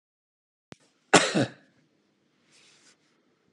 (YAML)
cough_length: 3.5 s
cough_amplitude: 25584
cough_signal_mean_std_ratio: 0.21
survey_phase: alpha (2021-03-01 to 2021-08-12)
age: 18-44
gender: Female
wearing_mask: 'No'
symptom_none: true
smoker_status: Never smoked
respiratory_condition_asthma: true
respiratory_condition_other: false
recruitment_source: REACT
submission_delay: 2 days
covid_test_result: Negative
covid_test_method: RT-qPCR